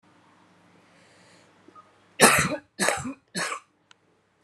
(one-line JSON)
{"three_cough_length": "4.4 s", "three_cough_amplitude": 31022, "three_cough_signal_mean_std_ratio": 0.31, "survey_phase": "alpha (2021-03-01 to 2021-08-12)", "age": "18-44", "gender": "Female", "wearing_mask": "No", "symptom_cough_any": true, "symptom_new_continuous_cough": true, "symptom_shortness_of_breath": true, "symptom_fatigue": true, "symptom_headache": true, "smoker_status": "Ex-smoker", "respiratory_condition_asthma": true, "respiratory_condition_other": false, "recruitment_source": "Test and Trace", "submission_delay": "2 days", "covid_test_result": "Positive", "covid_test_method": "RT-qPCR", "covid_ct_value": 14.4, "covid_ct_gene": "ORF1ab gene", "covid_ct_mean": 14.8, "covid_viral_load": "14000000 copies/ml", "covid_viral_load_category": "High viral load (>1M copies/ml)"}